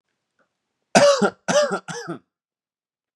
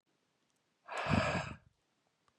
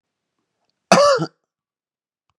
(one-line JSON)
{"three_cough_length": "3.2 s", "three_cough_amplitude": 32627, "three_cough_signal_mean_std_ratio": 0.37, "exhalation_length": "2.4 s", "exhalation_amplitude": 4227, "exhalation_signal_mean_std_ratio": 0.39, "cough_length": "2.4 s", "cough_amplitude": 32768, "cough_signal_mean_std_ratio": 0.29, "survey_phase": "beta (2021-08-13 to 2022-03-07)", "age": "18-44", "gender": "Male", "wearing_mask": "No", "symptom_none": true, "smoker_status": "Never smoked", "respiratory_condition_asthma": false, "respiratory_condition_other": false, "recruitment_source": "REACT", "submission_delay": "1 day", "covid_test_result": "Negative", "covid_test_method": "RT-qPCR", "influenza_a_test_result": "Negative", "influenza_b_test_result": "Negative"}